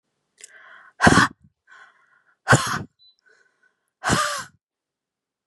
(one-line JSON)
{"exhalation_length": "5.5 s", "exhalation_amplitude": 32681, "exhalation_signal_mean_std_ratio": 0.3, "survey_phase": "beta (2021-08-13 to 2022-03-07)", "age": "18-44", "gender": "Female", "wearing_mask": "No", "symptom_none": true, "smoker_status": "Never smoked", "respiratory_condition_asthma": false, "respiratory_condition_other": false, "recruitment_source": "REACT", "submission_delay": "2 days", "covid_test_result": "Negative", "covid_test_method": "RT-qPCR", "influenza_a_test_result": "Negative", "influenza_b_test_result": "Negative"}